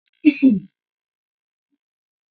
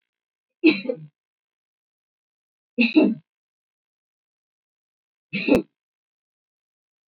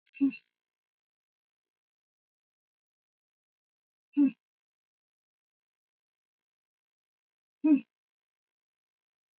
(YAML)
cough_length: 2.3 s
cough_amplitude: 26353
cough_signal_mean_std_ratio: 0.27
three_cough_length: 7.1 s
three_cough_amplitude: 20228
three_cough_signal_mean_std_ratio: 0.25
exhalation_length: 9.4 s
exhalation_amplitude: 6073
exhalation_signal_mean_std_ratio: 0.17
survey_phase: beta (2021-08-13 to 2022-03-07)
age: 45-64
gender: Female
wearing_mask: 'No'
symptom_cough_any: true
symptom_runny_or_blocked_nose: true
symptom_sore_throat: true
symptom_fever_high_temperature: true
symptom_headache: true
symptom_change_to_sense_of_smell_or_taste: true
symptom_loss_of_taste: true
symptom_onset: 4 days
smoker_status: Ex-smoker
respiratory_condition_asthma: true
respiratory_condition_other: false
recruitment_source: Test and Trace
submission_delay: 2 days
covid_test_result: Positive
covid_test_method: RT-qPCR
covid_ct_value: 26.1
covid_ct_gene: N gene
covid_ct_mean: 26.4
covid_viral_load: 2300 copies/ml
covid_viral_load_category: Minimal viral load (< 10K copies/ml)